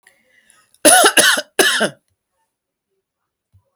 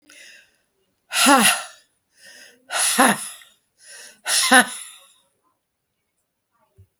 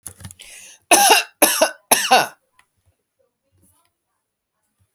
{"cough_length": "3.8 s", "cough_amplitude": 32768, "cough_signal_mean_std_ratio": 0.36, "exhalation_length": "7.0 s", "exhalation_amplitude": 32768, "exhalation_signal_mean_std_ratio": 0.34, "three_cough_length": "4.9 s", "three_cough_amplitude": 32768, "three_cough_signal_mean_std_ratio": 0.33, "survey_phase": "beta (2021-08-13 to 2022-03-07)", "age": "45-64", "gender": "Female", "wearing_mask": "No", "symptom_none": true, "smoker_status": "Ex-smoker", "respiratory_condition_asthma": false, "respiratory_condition_other": false, "recruitment_source": "REACT", "submission_delay": "2 days", "covid_test_result": "Negative", "covid_test_method": "RT-qPCR"}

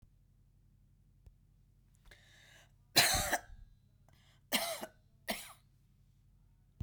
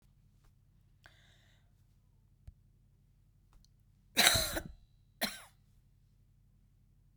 {"three_cough_length": "6.8 s", "three_cough_amplitude": 9470, "three_cough_signal_mean_std_ratio": 0.29, "cough_length": "7.2 s", "cough_amplitude": 18556, "cough_signal_mean_std_ratio": 0.23, "survey_phase": "beta (2021-08-13 to 2022-03-07)", "age": "65+", "gender": "Female", "wearing_mask": "No", "symptom_cough_any": true, "symptom_runny_or_blocked_nose": true, "symptom_onset": "11 days", "smoker_status": "Never smoked", "respiratory_condition_asthma": false, "respiratory_condition_other": false, "recruitment_source": "REACT", "submission_delay": "1 day", "covid_test_result": "Negative", "covid_test_method": "RT-qPCR"}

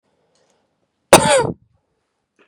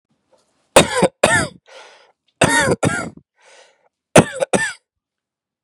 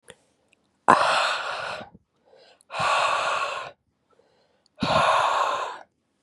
{"cough_length": "2.5 s", "cough_amplitude": 32768, "cough_signal_mean_std_ratio": 0.27, "three_cough_length": "5.6 s", "three_cough_amplitude": 32768, "three_cough_signal_mean_std_ratio": 0.36, "exhalation_length": "6.2 s", "exhalation_amplitude": 32768, "exhalation_signal_mean_std_ratio": 0.53, "survey_phase": "beta (2021-08-13 to 2022-03-07)", "age": "18-44", "gender": "Male", "wearing_mask": "No", "symptom_runny_or_blocked_nose": true, "symptom_sore_throat": true, "symptom_onset": "12 days", "smoker_status": "Never smoked", "respiratory_condition_asthma": true, "respiratory_condition_other": false, "recruitment_source": "REACT", "submission_delay": "3 days", "covid_test_result": "Negative", "covid_test_method": "RT-qPCR", "influenza_a_test_result": "Negative", "influenza_b_test_result": "Negative"}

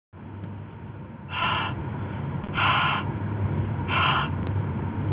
{"exhalation_length": "5.1 s", "exhalation_amplitude": 9643, "exhalation_signal_mean_std_ratio": 0.96, "survey_phase": "beta (2021-08-13 to 2022-03-07)", "age": "18-44", "gender": "Male", "wearing_mask": "No", "symptom_runny_or_blocked_nose": true, "symptom_onset": "8 days", "smoker_status": "Never smoked", "respiratory_condition_asthma": false, "respiratory_condition_other": false, "recruitment_source": "REACT", "submission_delay": "1 day", "covid_test_result": "Negative", "covid_test_method": "RT-qPCR", "influenza_a_test_result": "Unknown/Void", "influenza_b_test_result": "Unknown/Void"}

